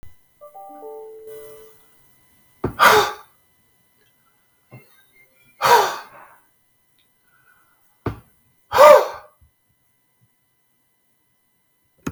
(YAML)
exhalation_length: 12.1 s
exhalation_amplitude: 32766
exhalation_signal_mean_std_ratio: 0.24
survey_phase: beta (2021-08-13 to 2022-03-07)
age: 45-64
gender: Male
wearing_mask: 'No'
symptom_none: true
smoker_status: Never smoked
respiratory_condition_asthma: false
respiratory_condition_other: false
recruitment_source: REACT
submission_delay: 2 days
covid_test_result: Negative
covid_test_method: RT-qPCR